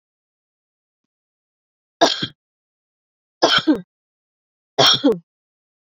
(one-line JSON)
{"three_cough_length": "5.8 s", "three_cough_amplitude": 30099, "three_cough_signal_mean_std_ratio": 0.29, "survey_phase": "beta (2021-08-13 to 2022-03-07)", "age": "18-44", "gender": "Female", "wearing_mask": "No", "symptom_runny_or_blocked_nose": true, "symptom_sore_throat": true, "symptom_abdominal_pain": true, "symptom_fatigue": true, "symptom_onset": "12 days", "smoker_status": "Ex-smoker", "respiratory_condition_asthma": false, "respiratory_condition_other": false, "recruitment_source": "REACT", "submission_delay": "1 day", "covid_test_result": "Negative", "covid_test_method": "RT-qPCR"}